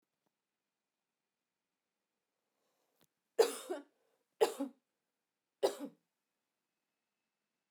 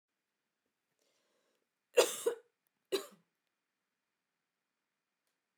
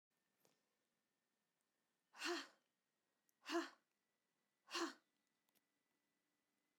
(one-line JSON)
{"three_cough_length": "7.7 s", "three_cough_amplitude": 5142, "three_cough_signal_mean_std_ratio": 0.18, "cough_length": "5.6 s", "cough_amplitude": 6389, "cough_signal_mean_std_ratio": 0.18, "exhalation_length": "6.8 s", "exhalation_amplitude": 920, "exhalation_signal_mean_std_ratio": 0.25, "survey_phase": "beta (2021-08-13 to 2022-03-07)", "age": "45-64", "gender": "Female", "wearing_mask": "No", "symptom_none": true, "smoker_status": "Never smoked", "respiratory_condition_asthma": false, "respiratory_condition_other": false, "recruitment_source": "REACT", "submission_delay": "2 days", "covid_test_result": "Negative", "covid_test_method": "RT-qPCR", "influenza_a_test_result": "Negative", "influenza_b_test_result": "Negative"}